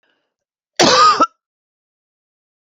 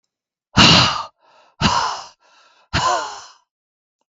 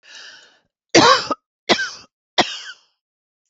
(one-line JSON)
{"cough_length": "2.6 s", "cough_amplitude": 32768, "cough_signal_mean_std_ratio": 0.35, "exhalation_length": "4.1 s", "exhalation_amplitude": 32768, "exhalation_signal_mean_std_ratio": 0.41, "three_cough_length": "3.5 s", "three_cough_amplitude": 32768, "three_cough_signal_mean_std_ratio": 0.33, "survey_phase": "beta (2021-08-13 to 2022-03-07)", "age": "45-64", "gender": "Female", "wearing_mask": "No", "symptom_headache": true, "smoker_status": "Never smoked", "respiratory_condition_asthma": true, "respiratory_condition_other": false, "recruitment_source": "REACT", "submission_delay": "2 days", "covid_test_result": "Negative", "covid_test_method": "RT-qPCR", "influenza_a_test_result": "Negative", "influenza_b_test_result": "Negative"}